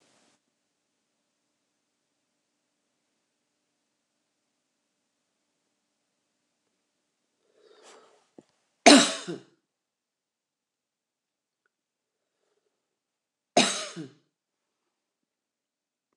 {
  "cough_length": "16.2 s",
  "cough_amplitude": 27818,
  "cough_signal_mean_std_ratio": 0.13,
  "survey_phase": "alpha (2021-03-01 to 2021-08-12)",
  "age": "65+",
  "gender": "Female",
  "wearing_mask": "No",
  "symptom_diarrhoea": true,
  "smoker_status": "Ex-smoker",
  "respiratory_condition_asthma": false,
  "respiratory_condition_other": false,
  "recruitment_source": "REACT",
  "submission_delay": "2 days",
  "covid_test_result": "Negative",
  "covid_test_method": "RT-qPCR"
}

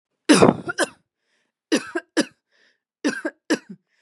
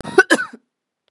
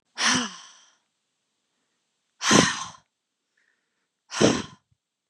{
  "three_cough_length": "4.0 s",
  "three_cough_amplitude": 32766,
  "three_cough_signal_mean_std_ratio": 0.33,
  "cough_length": "1.1 s",
  "cough_amplitude": 32768,
  "cough_signal_mean_std_ratio": 0.32,
  "exhalation_length": "5.3 s",
  "exhalation_amplitude": 31252,
  "exhalation_signal_mean_std_ratio": 0.32,
  "survey_phase": "beta (2021-08-13 to 2022-03-07)",
  "age": "18-44",
  "gender": "Female",
  "wearing_mask": "No",
  "symptom_cough_any": true,
  "symptom_runny_or_blocked_nose": true,
  "symptom_shortness_of_breath": true,
  "symptom_sore_throat": true,
  "symptom_fatigue": true,
  "symptom_headache": true,
  "symptom_onset": "9 days",
  "smoker_status": "Never smoked",
  "respiratory_condition_asthma": true,
  "respiratory_condition_other": false,
  "recruitment_source": "Test and Trace",
  "submission_delay": "2 days",
  "covid_test_result": "Positive",
  "covid_test_method": "RT-qPCR",
  "covid_ct_value": 26.4,
  "covid_ct_gene": "N gene"
}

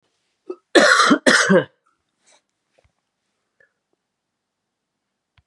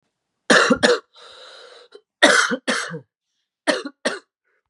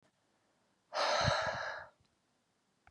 {
  "cough_length": "5.5 s",
  "cough_amplitude": 32767,
  "cough_signal_mean_std_ratio": 0.31,
  "three_cough_length": "4.7 s",
  "three_cough_amplitude": 32767,
  "three_cough_signal_mean_std_ratio": 0.4,
  "exhalation_length": "2.9 s",
  "exhalation_amplitude": 3936,
  "exhalation_signal_mean_std_ratio": 0.45,
  "survey_phase": "beta (2021-08-13 to 2022-03-07)",
  "age": "18-44",
  "gender": "Male",
  "wearing_mask": "No",
  "symptom_cough_any": true,
  "symptom_runny_or_blocked_nose": true,
  "symptom_fatigue": true,
  "symptom_fever_high_temperature": true,
  "symptom_headache": true,
  "symptom_onset": "3 days",
  "smoker_status": "Never smoked",
  "respiratory_condition_asthma": false,
  "respiratory_condition_other": false,
  "recruitment_source": "Test and Trace",
  "submission_delay": "2 days",
  "covid_test_result": "Positive",
  "covid_test_method": "RT-qPCR",
  "covid_ct_value": 18.3,
  "covid_ct_gene": "ORF1ab gene"
}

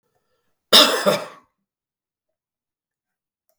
{
  "cough_length": "3.6 s",
  "cough_amplitude": 32768,
  "cough_signal_mean_std_ratio": 0.25,
  "survey_phase": "beta (2021-08-13 to 2022-03-07)",
  "age": "65+",
  "gender": "Male",
  "wearing_mask": "No",
  "symptom_none": true,
  "symptom_onset": "4 days",
  "smoker_status": "Never smoked",
  "respiratory_condition_asthma": false,
  "respiratory_condition_other": false,
  "recruitment_source": "REACT",
  "submission_delay": "1 day",
  "covid_test_result": "Negative",
  "covid_test_method": "RT-qPCR",
  "influenza_a_test_result": "Negative",
  "influenza_b_test_result": "Negative"
}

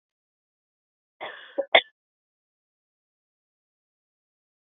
{
  "cough_length": "4.6 s",
  "cough_amplitude": 27945,
  "cough_signal_mean_std_ratio": 0.12,
  "survey_phase": "beta (2021-08-13 to 2022-03-07)",
  "age": "18-44",
  "gender": "Female",
  "wearing_mask": "No",
  "symptom_abdominal_pain": true,
  "symptom_fatigue": true,
  "smoker_status": "Never smoked",
  "respiratory_condition_asthma": false,
  "respiratory_condition_other": false,
  "recruitment_source": "REACT",
  "submission_delay": "4 days",
  "covid_test_result": "Negative",
  "covid_test_method": "RT-qPCR"
}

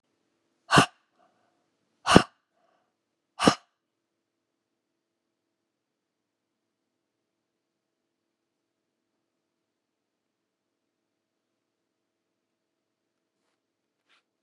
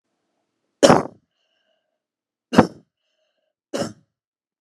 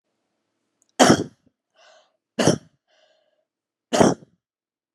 {
  "exhalation_length": "14.4 s",
  "exhalation_amplitude": 32768,
  "exhalation_signal_mean_std_ratio": 0.12,
  "three_cough_length": "4.6 s",
  "three_cough_amplitude": 32768,
  "three_cough_signal_mean_std_ratio": 0.2,
  "cough_length": "4.9 s",
  "cough_amplitude": 32689,
  "cough_signal_mean_std_ratio": 0.26,
  "survey_phase": "alpha (2021-03-01 to 2021-08-12)",
  "age": "45-64",
  "gender": "Female",
  "wearing_mask": "No",
  "symptom_none": true,
  "smoker_status": "Never smoked",
  "respiratory_condition_asthma": false,
  "respiratory_condition_other": false,
  "recruitment_source": "REACT",
  "submission_delay": "1 day",
  "covid_test_result": "Negative",
  "covid_test_method": "RT-qPCR"
}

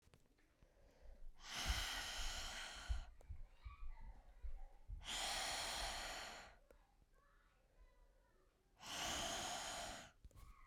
{
  "exhalation_length": "10.7 s",
  "exhalation_amplitude": 1347,
  "exhalation_signal_mean_std_ratio": 0.7,
  "survey_phase": "beta (2021-08-13 to 2022-03-07)",
  "age": "18-44",
  "gender": "Female",
  "wearing_mask": "No",
  "symptom_cough_any": true,
  "symptom_runny_or_blocked_nose": true,
  "symptom_sore_throat": true,
  "symptom_abdominal_pain": true,
  "symptom_diarrhoea": true,
  "symptom_fatigue": true,
  "symptom_fever_high_temperature": true,
  "symptom_headache": true,
  "symptom_onset": "4 days",
  "smoker_status": "Never smoked",
  "respiratory_condition_asthma": false,
  "respiratory_condition_other": false,
  "recruitment_source": "Test and Trace",
  "submission_delay": "3 days",
  "covid_test_result": "Positive",
  "covid_test_method": "ePCR"
}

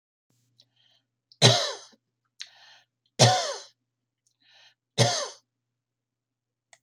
{
  "three_cough_length": "6.8 s",
  "three_cough_amplitude": 26363,
  "three_cough_signal_mean_std_ratio": 0.27,
  "survey_phase": "alpha (2021-03-01 to 2021-08-12)",
  "age": "65+",
  "gender": "Female",
  "wearing_mask": "No",
  "symptom_none": true,
  "smoker_status": "Never smoked",
  "respiratory_condition_asthma": false,
  "respiratory_condition_other": false,
  "recruitment_source": "REACT",
  "submission_delay": "1 day",
  "covid_test_result": "Negative",
  "covid_test_method": "RT-qPCR"
}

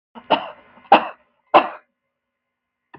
{
  "three_cough_length": "3.0 s",
  "three_cough_amplitude": 32768,
  "three_cough_signal_mean_std_ratio": 0.25,
  "survey_phase": "beta (2021-08-13 to 2022-03-07)",
  "age": "65+",
  "gender": "Female",
  "wearing_mask": "No",
  "symptom_runny_or_blocked_nose": true,
  "smoker_status": "Never smoked",
  "respiratory_condition_asthma": false,
  "respiratory_condition_other": false,
  "recruitment_source": "REACT",
  "submission_delay": "1 day",
  "covid_test_result": "Negative",
  "covid_test_method": "RT-qPCR",
  "influenza_a_test_result": "Negative",
  "influenza_b_test_result": "Negative"
}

